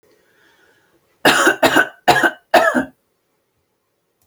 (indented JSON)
{
  "cough_length": "4.3 s",
  "cough_amplitude": 32767,
  "cough_signal_mean_std_ratio": 0.4,
  "survey_phase": "beta (2021-08-13 to 2022-03-07)",
  "age": "45-64",
  "gender": "Female",
  "wearing_mask": "No",
  "symptom_none": true,
  "smoker_status": "Ex-smoker",
  "respiratory_condition_asthma": false,
  "respiratory_condition_other": false,
  "recruitment_source": "REACT",
  "submission_delay": "2 days",
  "covid_test_result": "Negative",
  "covid_test_method": "RT-qPCR"
}